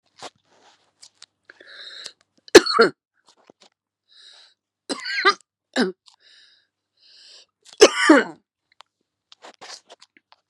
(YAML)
three_cough_length: 10.5 s
three_cough_amplitude: 32768
three_cough_signal_mean_std_ratio: 0.22
survey_phase: alpha (2021-03-01 to 2021-08-12)
age: 45-64
gender: Female
wearing_mask: 'No'
symptom_cough_any: true
symptom_new_continuous_cough: true
symptom_abdominal_pain: true
symptom_fatigue: true
symptom_headache: true
symptom_change_to_sense_of_smell_or_taste: true
symptom_loss_of_taste: true
symptom_onset: 3 days
smoker_status: Ex-smoker
respiratory_condition_asthma: false
respiratory_condition_other: false
recruitment_source: Test and Trace
submission_delay: 1 day
covid_test_result: Positive
covid_test_method: RT-qPCR
covid_ct_value: 18.7
covid_ct_gene: ORF1ab gene